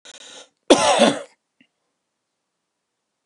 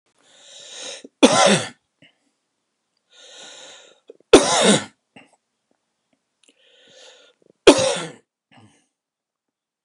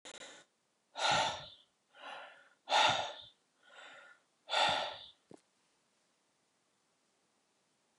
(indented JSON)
{
  "cough_length": "3.3 s",
  "cough_amplitude": 30021,
  "cough_signal_mean_std_ratio": 0.3,
  "three_cough_length": "9.8 s",
  "three_cough_amplitude": 31458,
  "three_cough_signal_mean_std_ratio": 0.27,
  "exhalation_length": "8.0 s",
  "exhalation_amplitude": 4817,
  "exhalation_signal_mean_std_ratio": 0.35,
  "survey_phase": "alpha (2021-03-01 to 2021-08-12)",
  "age": "45-64",
  "gender": "Male",
  "wearing_mask": "No",
  "symptom_abdominal_pain": true,
  "symptom_fatigue": true,
  "smoker_status": "Never smoked",
  "respiratory_condition_asthma": false,
  "respiratory_condition_other": false,
  "recruitment_source": "REACT",
  "submission_delay": "1 day",
  "covid_test_result": "Negative",
  "covid_test_method": "RT-qPCR"
}